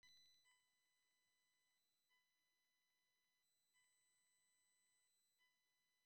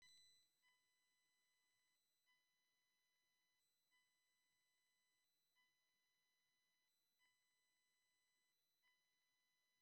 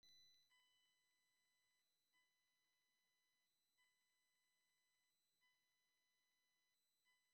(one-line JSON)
{"three_cough_length": "6.1 s", "three_cough_amplitude": 29, "three_cough_signal_mean_std_ratio": 0.63, "exhalation_length": "9.8 s", "exhalation_amplitude": 30, "exhalation_signal_mean_std_ratio": 0.6, "cough_length": "7.3 s", "cough_amplitude": 22, "cough_signal_mean_std_ratio": 0.59, "survey_phase": "beta (2021-08-13 to 2022-03-07)", "age": "65+", "gender": "Male", "wearing_mask": "No", "symptom_shortness_of_breath": true, "symptom_loss_of_taste": true, "smoker_status": "Ex-smoker", "respiratory_condition_asthma": false, "respiratory_condition_other": false, "recruitment_source": "REACT", "submission_delay": "2 days", "covid_test_result": "Negative", "covid_test_method": "RT-qPCR", "influenza_a_test_result": "Negative", "influenza_b_test_result": "Negative"}